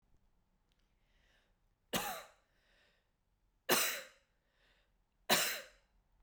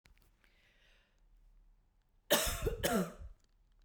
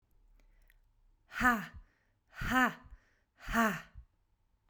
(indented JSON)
{
  "three_cough_length": "6.2 s",
  "three_cough_amplitude": 6224,
  "three_cough_signal_mean_std_ratio": 0.29,
  "cough_length": "3.8 s",
  "cough_amplitude": 7318,
  "cough_signal_mean_std_ratio": 0.37,
  "exhalation_length": "4.7 s",
  "exhalation_amplitude": 6625,
  "exhalation_signal_mean_std_ratio": 0.36,
  "survey_phase": "beta (2021-08-13 to 2022-03-07)",
  "age": "18-44",
  "gender": "Female",
  "wearing_mask": "No",
  "symptom_none": true,
  "smoker_status": "Never smoked",
  "respiratory_condition_asthma": true,
  "respiratory_condition_other": false,
  "recruitment_source": "Test and Trace",
  "submission_delay": "-1 day",
  "covid_test_result": "Negative",
  "covid_test_method": "LFT"
}